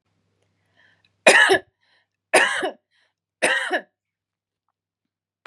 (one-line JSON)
{"three_cough_length": "5.5 s", "three_cough_amplitude": 32710, "three_cough_signal_mean_std_ratio": 0.31, "survey_phase": "beta (2021-08-13 to 2022-03-07)", "age": "45-64", "gender": "Female", "wearing_mask": "No", "symptom_runny_or_blocked_nose": true, "symptom_onset": "13 days", "smoker_status": "Never smoked", "respiratory_condition_asthma": false, "respiratory_condition_other": false, "recruitment_source": "REACT", "submission_delay": "6 days", "covid_test_result": "Negative", "covid_test_method": "RT-qPCR", "influenza_a_test_result": "Negative", "influenza_b_test_result": "Negative"}